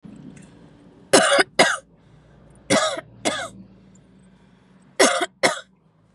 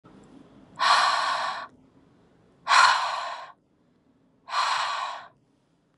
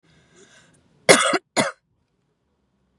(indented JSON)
{
  "three_cough_length": "6.1 s",
  "three_cough_amplitude": 32118,
  "three_cough_signal_mean_std_ratio": 0.38,
  "exhalation_length": "6.0 s",
  "exhalation_amplitude": 18388,
  "exhalation_signal_mean_std_ratio": 0.47,
  "cough_length": "3.0 s",
  "cough_amplitude": 32768,
  "cough_signal_mean_std_ratio": 0.26,
  "survey_phase": "beta (2021-08-13 to 2022-03-07)",
  "age": "18-44",
  "gender": "Female",
  "wearing_mask": "No",
  "symptom_runny_or_blocked_nose": true,
  "symptom_headache": true,
  "symptom_change_to_sense_of_smell_or_taste": true,
  "symptom_onset": "12 days",
  "smoker_status": "Never smoked",
  "respiratory_condition_asthma": false,
  "respiratory_condition_other": false,
  "recruitment_source": "REACT",
  "submission_delay": "2 days",
  "covid_test_result": "Negative",
  "covid_test_method": "RT-qPCR",
  "influenza_a_test_result": "Negative",
  "influenza_b_test_result": "Negative"
}